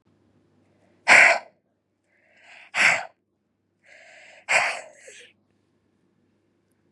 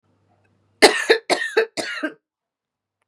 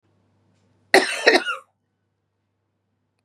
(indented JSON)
{
  "exhalation_length": "6.9 s",
  "exhalation_amplitude": 27777,
  "exhalation_signal_mean_std_ratio": 0.26,
  "three_cough_length": "3.1 s",
  "three_cough_amplitude": 32768,
  "three_cough_signal_mean_std_ratio": 0.34,
  "cough_length": "3.2 s",
  "cough_amplitude": 32767,
  "cough_signal_mean_std_ratio": 0.26,
  "survey_phase": "beta (2021-08-13 to 2022-03-07)",
  "age": "18-44",
  "gender": "Female",
  "wearing_mask": "Yes",
  "symptom_cough_any": true,
  "symptom_runny_or_blocked_nose": true,
  "symptom_headache": true,
  "symptom_onset": "3 days",
  "smoker_status": "Never smoked",
  "respiratory_condition_asthma": false,
  "respiratory_condition_other": false,
  "recruitment_source": "Test and Trace",
  "submission_delay": "1 day",
  "covid_test_result": "Positive",
  "covid_test_method": "RT-qPCR",
  "covid_ct_value": 17.8,
  "covid_ct_gene": "ORF1ab gene"
}